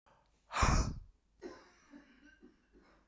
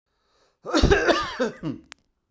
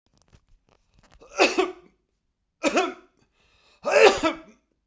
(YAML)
exhalation_length: 3.1 s
exhalation_amplitude: 4772
exhalation_signal_mean_std_ratio: 0.33
cough_length: 2.3 s
cough_amplitude: 19119
cough_signal_mean_std_ratio: 0.47
three_cough_length: 4.9 s
three_cough_amplitude: 29527
three_cough_signal_mean_std_ratio: 0.33
survey_phase: beta (2021-08-13 to 2022-03-07)
age: 65+
gender: Male
wearing_mask: 'No'
symptom_none: true
smoker_status: Never smoked
respiratory_condition_asthma: false
respiratory_condition_other: false
recruitment_source: REACT
submission_delay: 3 days
covid_test_result: Negative
covid_test_method: RT-qPCR